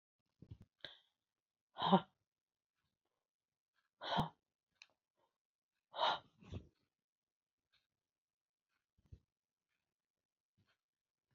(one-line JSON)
{"exhalation_length": "11.3 s", "exhalation_amplitude": 5178, "exhalation_signal_mean_std_ratio": 0.18, "survey_phase": "alpha (2021-03-01 to 2021-08-12)", "age": "45-64", "gender": "Female", "wearing_mask": "No", "symptom_none": true, "smoker_status": "Never smoked", "respiratory_condition_asthma": false, "respiratory_condition_other": false, "recruitment_source": "REACT", "submission_delay": "1 day", "covid_test_result": "Negative", "covid_test_method": "RT-qPCR"}